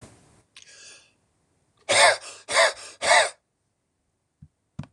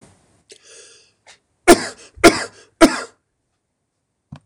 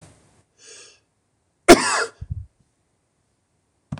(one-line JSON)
{"exhalation_length": "4.9 s", "exhalation_amplitude": 21742, "exhalation_signal_mean_std_ratio": 0.33, "three_cough_length": "4.5 s", "three_cough_amplitude": 26028, "three_cough_signal_mean_std_ratio": 0.24, "cough_length": "4.0 s", "cough_amplitude": 26028, "cough_signal_mean_std_ratio": 0.21, "survey_phase": "beta (2021-08-13 to 2022-03-07)", "age": "45-64", "gender": "Male", "wearing_mask": "No", "symptom_none": true, "smoker_status": "Never smoked", "respiratory_condition_asthma": false, "respiratory_condition_other": false, "recruitment_source": "REACT", "submission_delay": "2 days", "covid_test_result": "Negative", "covid_test_method": "RT-qPCR", "influenza_a_test_result": "Negative", "influenza_b_test_result": "Negative"}